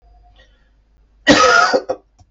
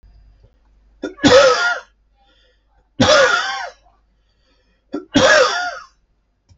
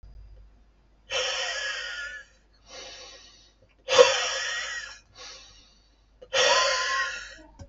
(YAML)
cough_length: 2.3 s
cough_amplitude: 31027
cough_signal_mean_std_ratio: 0.42
three_cough_length: 6.6 s
three_cough_amplitude: 32767
three_cough_signal_mean_std_ratio: 0.43
exhalation_length: 7.7 s
exhalation_amplitude: 24737
exhalation_signal_mean_std_ratio: 0.45
survey_phase: alpha (2021-03-01 to 2021-08-12)
age: 45-64
gender: Male
wearing_mask: 'No'
symptom_none: true
smoker_status: Ex-smoker
respiratory_condition_asthma: false
respiratory_condition_other: false
recruitment_source: REACT
submission_delay: 1 day
covid_test_result: Negative
covid_test_method: RT-qPCR